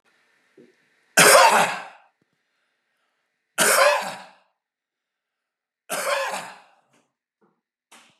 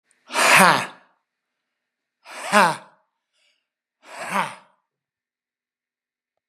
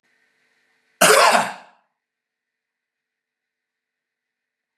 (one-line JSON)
{"three_cough_length": "8.2 s", "three_cough_amplitude": 30823, "three_cough_signal_mean_std_ratio": 0.32, "exhalation_length": "6.5 s", "exhalation_amplitude": 32377, "exhalation_signal_mean_std_ratio": 0.29, "cough_length": "4.8 s", "cough_amplitude": 32768, "cough_signal_mean_std_ratio": 0.25, "survey_phase": "beta (2021-08-13 to 2022-03-07)", "age": "65+", "gender": "Male", "wearing_mask": "No", "symptom_none": true, "smoker_status": "Never smoked", "respiratory_condition_asthma": false, "respiratory_condition_other": false, "recruitment_source": "REACT", "submission_delay": "2 days", "covid_test_result": "Negative", "covid_test_method": "RT-qPCR", "influenza_a_test_result": "Negative", "influenza_b_test_result": "Negative"}